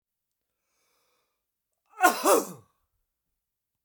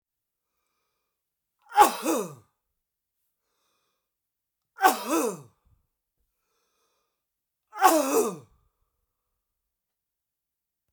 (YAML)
cough_length: 3.8 s
cough_amplitude: 17784
cough_signal_mean_std_ratio: 0.24
three_cough_length: 10.9 s
three_cough_amplitude: 22939
three_cough_signal_mean_std_ratio: 0.26
survey_phase: beta (2021-08-13 to 2022-03-07)
age: 65+
gender: Male
wearing_mask: 'No'
symptom_runny_or_blocked_nose: true
smoker_status: Never smoked
respiratory_condition_asthma: false
respiratory_condition_other: false
recruitment_source: REACT
submission_delay: 2 days
covid_test_result: Negative
covid_test_method: RT-qPCR
influenza_a_test_result: Unknown/Void
influenza_b_test_result: Unknown/Void